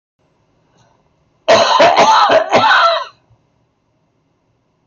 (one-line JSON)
{"cough_length": "4.9 s", "cough_amplitude": 27150, "cough_signal_mean_std_ratio": 0.51, "survey_phase": "beta (2021-08-13 to 2022-03-07)", "age": "65+", "gender": "Male", "wearing_mask": "No", "symptom_none": true, "symptom_onset": "12 days", "smoker_status": "Never smoked", "respiratory_condition_asthma": false, "respiratory_condition_other": false, "recruitment_source": "REACT", "submission_delay": "3 days", "covid_test_result": "Negative", "covid_test_method": "RT-qPCR", "influenza_a_test_result": "Negative", "influenza_b_test_result": "Negative"}